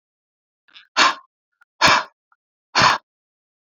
exhalation_length: 3.8 s
exhalation_amplitude: 27418
exhalation_signal_mean_std_ratio: 0.32
survey_phase: beta (2021-08-13 to 2022-03-07)
age: 45-64
gender: Female
wearing_mask: 'No'
symptom_cough_any: true
smoker_status: Current smoker (11 or more cigarettes per day)
respiratory_condition_asthma: true
respiratory_condition_other: false
recruitment_source: Test and Trace
submission_delay: 1 day
covid_test_result: Positive
covid_test_method: RT-qPCR
covid_ct_value: 18.5
covid_ct_gene: ORF1ab gene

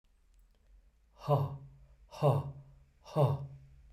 exhalation_length: 3.9 s
exhalation_amplitude: 5393
exhalation_signal_mean_std_ratio: 0.41
survey_phase: beta (2021-08-13 to 2022-03-07)
age: 45-64
gender: Male
wearing_mask: 'No'
symptom_none: true
smoker_status: Never smoked
respiratory_condition_asthma: false
respiratory_condition_other: false
recruitment_source: REACT
submission_delay: 1 day
covid_test_result: Negative
covid_test_method: RT-qPCR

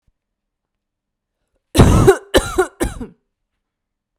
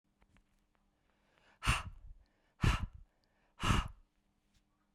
cough_length: 4.2 s
cough_amplitude: 32768
cough_signal_mean_std_ratio: 0.33
exhalation_length: 4.9 s
exhalation_amplitude: 5054
exhalation_signal_mean_std_ratio: 0.3
survey_phase: beta (2021-08-13 to 2022-03-07)
age: 45-64
gender: Female
wearing_mask: 'No'
symptom_none: true
smoker_status: Never smoked
respiratory_condition_asthma: true
respiratory_condition_other: false
recruitment_source: REACT
submission_delay: 0 days
covid_test_result: Negative
covid_test_method: RT-qPCR
influenza_a_test_result: Negative
influenza_b_test_result: Negative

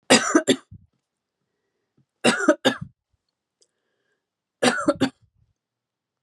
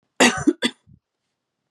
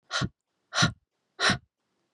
three_cough_length: 6.2 s
three_cough_amplitude: 31285
three_cough_signal_mean_std_ratio: 0.31
cough_length: 1.7 s
cough_amplitude: 29101
cough_signal_mean_std_ratio: 0.32
exhalation_length: 2.1 s
exhalation_amplitude: 12660
exhalation_signal_mean_std_ratio: 0.37
survey_phase: beta (2021-08-13 to 2022-03-07)
age: 18-44
gender: Female
wearing_mask: 'No'
symptom_fatigue: true
symptom_change_to_sense_of_smell_or_taste: true
symptom_loss_of_taste: true
symptom_onset: 5 days
smoker_status: Current smoker (11 or more cigarettes per day)
respiratory_condition_asthma: false
respiratory_condition_other: false
recruitment_source: Test and Trace
submission_delay: 2 days
covid_test_result: Positive
covid_test_method: RT-qPCR
covid_ct_value: 16.2
covid_ct_gene: ORF1ab gene
covid_ct_mean: 16.6
covid_viral_load: 3500000 copies/ml
covid_viral_load_category: High viral load (>1M copies/ml)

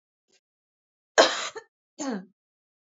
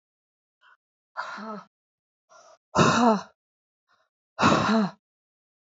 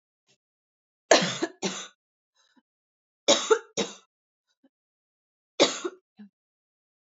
cough_length: 2.8 s
cough_amplitude: 20706
cough_signal_mean_std_ratio: 0.25
exhalation_length: 5.6 s
exhalation_amplitude: 17347
exhalation_signal_mean_std_ratio: 0.36
three_cough_length: 7.1 s
three_cough_amplitude: 30163
three_cough_signal_mean_std_ratio: 0.26
survey_phase: beta (2021-08-13 to 2022-03-07)
age: 18-44
gender: Female
wearing_mask: 'No'
symptom_cough_any: true
symptom_runny_or_blocked_nose: true
symptom_sore_throat: true
symptom_onset: 2 days
smoker_status: Never smoked
respiratory_condition_asthma: false
respiratory_condition_other: false
recruitment_source: Test and Trace
submission_delay: 1 day
covid_test_result: Positive
covid_test_method: RT-qPCR
covid_ct_value: 28.8
covid_ct_gene: ORF1ab gene
covid_ct_mean: 29.2
covid_viral_load: 270 copies/ml
covid_viral_load_category: Minimal viral load (< 10K copies/ml)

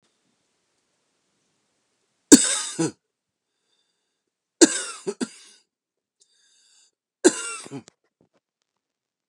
three_cough_length: 9.3 s
three_cough_amplitude: 32768
three_cough_signal_mean_std_ratio: 0.19
survey_phase: beta (2021-08-13 to 2022-03-07)
age: 45-64
gender: Male
wearing_mask: 'No'
symptom_runny_or_blocked_nose: true
symptom_sore_throat: true
symptom_fatigue: true
symptom_headache: true
symptom_change_to_sense_of_smell_or_taste: true
symptom_loss_of_taste: true
symptom_onset: 9 days
smoker_status: Ex-smoker
respiratory_condition_asthma: true
respiratory_condition_other: false
recruitment_source: Test and Trace
submission_delay: 2 days
covid_test_result: Positive
covid_test_method: RT-qPCR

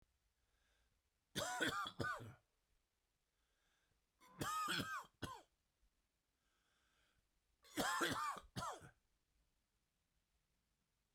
three_cough_length: 11.1 s
three_cough_amplitude: 1728
three_cough_signal_mean_std_ratio: 0.39
survey_phase: beta (2021-08-13 to 2022-03-07)
age: 45-64
gender: Male
wearing_mask: 'No'
symptom_cough_any: true
symptom_shortness_of_breath: true
symptom_sore_throat: true
symptom_change_to_sense_of_smell_or_taste: true
symptom_other: true
smoker_status: Ex-smoker
respiratory_condition_asthma: false
respiratory_condition_other: false
recruitment_source: Test and Trace
submission_delay: 0 days
covid_test_result: Positive
covid_test_method: LFT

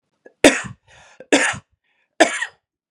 three_cough_length: 2.9 s
three_cough_amplitude: 32768
three_cough_signal_mean_std_ratio: 0.31
survey_phase: beta (2021-08-13 to 2022-03-07)
age: 18-44
gender: Male
wearing_mask: 'No'
symptom_none: true
smoker_status: Never smoked
respiratory_condition_asthma: true
respiratory_condition_other: false
recruitment_source: REACT
submission_delay: 2 days
covid_test_result: Negative
covid_test_method: RT-qPCR
influenza_a_test_result: Negative
influenza_b_test_result: Negative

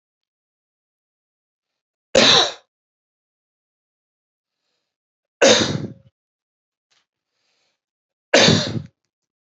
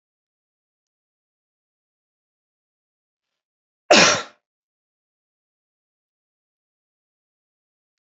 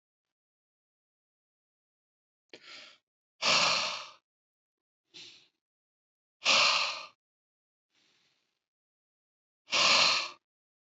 three_cough_length: 9.6 s
three_cough_amplitude: 29563
three_cough_signal_mean_std_ratio: 0.26
cough_length: 8.2 s
cough_amplitude: 32007
cough_signal_mean_std_ratio: 0.14
exhalation_length: 10.8 s
exhalation_amplitude: 10690
exhalation_signal_mean_std_ratio: 0.31
survey_phase: beta (2021-08-13 to 2022-03-07)
age: 45-64
gender: Male
wearing_mask: 'No'
symptom_none: true
smoker_status: Never smoked
respiratory_condition_asthma: false
respiratory_condition_other: false
recruitment_source: REACT
submission_delay: 1 day
covid_test_result: Negative
covid_test_method: RT-qPCR
influenza_a_test_result: Negative
influenza_b_test_result: Negative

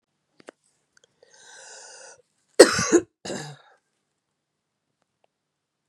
cough_length: 5.9 s
cough_amplitude: 32768
cough_signal_mean_std_ratio: 0.18
survey_phase: beta (2021-08-13 to 2022-03-07)
age: 45-64
gender: Female
wearing_mask: 'No'
symptom_runny_or_blocked_nose: true
symptom_sore_throat: true
symptom_fatigue: true
symptom_headache: true
symptom_change_to_sense_of_smell_or_taste: true
symptom_other: true
symptom_onset: 4 days
smoker_status: Ex-smoker
respiratory_condition_asthma: false
respiratory_condition_other: false
recruitment_source: Test and Trace
submission_delay: 2 days
covid_test_result: Positive
covid_test_method: RT-qPCR
covid_ct_value: 16.2
covid_ct_gene: ORF1ab gene
covid_ct_mean: 16.9
covid_viral_load: 2900000 copies/ml
covid_viral_load_category: High viral load (>1M copies/ml)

